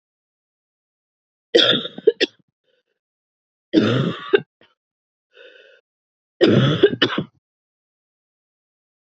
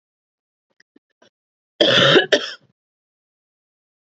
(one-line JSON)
{"three_cough_length": "9.0 s", "three_cough_amplitude": 28824, "three_cough_signal_mean_std_ratio": 0.32, "cough_length": "4.0 s", "cough_amplitude": 29222, "cough_signal_mean_std_ratio": 0.3, "survey_phase": "beta (2021-08-13 to 2022-03-07)", "age": "18-44", "gender": "Female", "wearing_mask": "No", "symptom_new_continuous_cough": true, "symptom_runny_or_blocked_nose": true, "symptom_sore_throat": true, "symptom_fatigue": true, "symptom_onset": "3 days", "smoker_status": "Never smoked", "respiratory_condition_asthma": false, "respiratory_condition_other": false, "recruitment_source": "Test and Trace", "submission_delay": "1 day", "covid_test_result": "Positive", "covid_test_method": "RT-qPCR", "covid_ct_value": 24.0, "covid_ct_gene": "ORF1ab gene", "covid_ct_mean": 24.1, "covid_viral_load": "13000 copies/ml", "covid_viral_load_category": "Low viral load (10K-1M copies/ml)"}